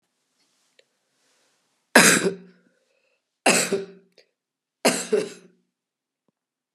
{"three_cough_length": "6.7 s", "three_cough_amplitude": 30875, "three_cough_signal_mean_std_ratio": 0.28, "survey_phase": "beta (2021-08-13 to 2022-03-07)", "age": "45-64", "gender": "Female", "wearing_mask": "No", "symptom_none": true, "smoker_status": "Never smoked", "respiratory_condition_asthma": false, "respiratory_condition_other": false, "recruitment_source": "REACT", "submission_delay": "1 day", "covid_test_result": "Negative", "covid_test_method": "RT-qPCR", "influenza_a_test_result": "Negative", "influenza_b_test_result": "Negative"}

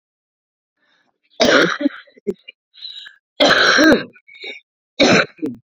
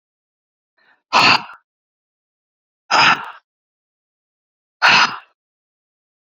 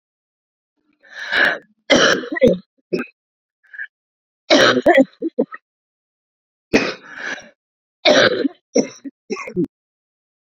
{"cough_length": "5.7 s", "cough_amplitude": 31750, "cough_signal_mean_std_ratio": 0.43, "exhalation_length": "6.4 s", "exhalation_amplitude": 30841, "exhalation_signal_mean_std_ratio": 0.3, "three_cough_length": "10.4 s", "three_cough_amplitude": 32535, "three_cough_signal_mean_std_ratio": 0.39, "survey_phase": "beta (2021-08-13 to 2022-03-07)", "age": "45-64", "gender": "Female", "wearing_mask": "No", "symptom_cough_any": true, "symptom_new_continuous_cough": true, "symptom_runny_or_blocked_nose": true, "symptom_shortness_of_breath": true, "symptom_sore_throat": true, "symptom_fatigue": true, "symptom_change_to_sense_of_smell_or_taste": true, "symptom_onset": "4 days", "smoker_status": "Current smoker (11 or more cigarettes per day)", "respiratory_condition_asthma": false, "respiratory_condition_other": false, "recruitment_source": "Test and Trace", "submission_delay": "1 day", "covid_test_result": "Positive", "covid_test_method": "RT-qPCR", "covid_ct_value": 18.5, "covid_ct_gene": "ORF1ab gene", "covid_ct_mean": 18.9, "covid_viral_load": "620000 copies/ml", "covid_viral_load_category": "Low viral load (10K-1M copies/ml)"}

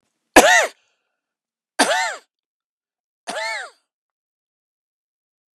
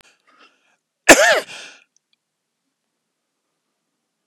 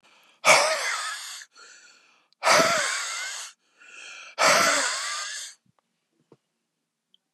{"three_cough_length": "5.5 s", "three_cough_amplitude": 32768, "three_cough_signal_mean_std_ratio": 0.27, "cough_length": "4.3 s", "cough_amplitude": 32768, "cough_signal_mean_std_ratio": 0.21, "exhalation_length": "7.3 s", "exhalation_amplitude": 22313, "exhalation_signal_mean_std_ratio": 0.46, "survey_phase": "beta (2021-08-13 to 2022-03-07)", "age": "65+", "gender": "Male", "wearing_mask": "No", "symptom_none": true, "smoker_status": "Never smoked", "respiratory_condition_asthma": false, "respiratory_condition_other": false, "recruitment_source": "REACT", "submission_delay": "2 days", "covid_test_result": "Negative", "covid_test_method": "RT-qPCR", "influenza_a_test_result": "Negative", "influenza_b_test_result": "Negative"}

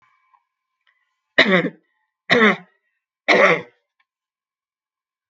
{"three_cough_length": "5.3 s", "three_cough_amplitude": 32768, "three_cough_signal_mean_std_ratio": 0.32, "survey_phase": "beta (2021-08-13 to 2022-03-07)", "age": "65+", "gender": "Female", "wearing_mask": "No", "symptom_none": true, "smoker_status": "Ex-smoker", "respiratory_condition_asthma": false, "respiratory_condition_other": false, "recruitment_source": "Test and Trace", "submission_delay": "1 day", "covid_test_result": "Negative", "covid_test_method": "RT-qPCR"}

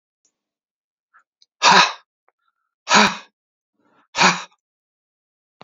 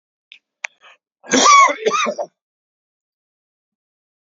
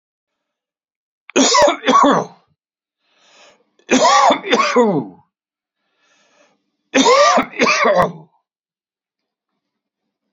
{"exhalation_length": "5.6 s", "exhalation_amplitude": 32767, "exhalation_signal_mean_std_ratio": 0.28, "cough_length": "4.3 s", "cough_amplitude": 31483, "cough_signal_mean_std_ratio": 0.33, "three_cough_length": "10.3 s", "three_cough_amplitude": 31435, "three_cough_signal_mean_std_ratio": 0.45, "survey_phase": "beta (2021-08-13 to 2022-03-07)", "age": "65+", "gender": "Male", "wearing_mask": "No", "symptom_none": true, "smoker_status": "Ex-smoker", "respiratory_condition_asthma": false, "respiratory_condition_other": false, "recruitment_source": "REACT", "submission_delay": "3 days", "covid_test_result": "Negative", "covid_test_method": "RT-qPCR", "influenza_a_test_result": "Negative", "influenza_b_test_result": "Negative"}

